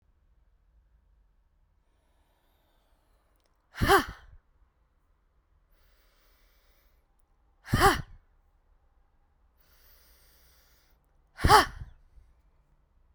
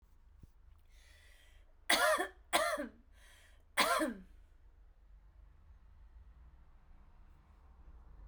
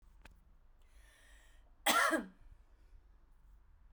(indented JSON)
{
  "exhalation_length": "13.1 s",
  "exhalation_amplitude": 22730,
  "exhalation_signal_mean_std_ratio": 0.2,
  "three_cough_length": "8.3 s",
  "three_cough_amplitude": 6737,
  "three_cough_signal_mean_std_ratio": 0.36,
  "cough_length": "3.9 s",
  "cough_amplitude": 5437,
  "cough_signal_mean_std_ratio": 0.32,
  "survey_phase": "beta (2021-08-13 to 2022-03-07)",
  "age": "45-64",
  "gender": "Female",
  "wearing_mask": "No",
  "symptom_cough_any": true,
  "symptom_change_to_sense_of_smell_or_taste": true,
  "symptom_loss_of_taste": true,
  "symptom_other": true,
  "symptom_onset": "7 days",
  "smoker_status": "Never smoked",
  "respiratory_condition_asthma": true,
  "respiratory_condition_other": false,
  "recruitment_source": "Test and Trace",
  "submission_delay": "1 day",
  "covid_test_result": "Positive",
  "covid_test_method": "RT-qPCR",
  "covid_ct_value": 18.8,
  "covid_ct_gene": "ORF1ab gene",
  "covid_ct_mean": 19.2,
  "covid_viral_load": "500000 copies/ml",
  "covid_viral_load_category": "Low viral load (10K-1M copies/ml)"
}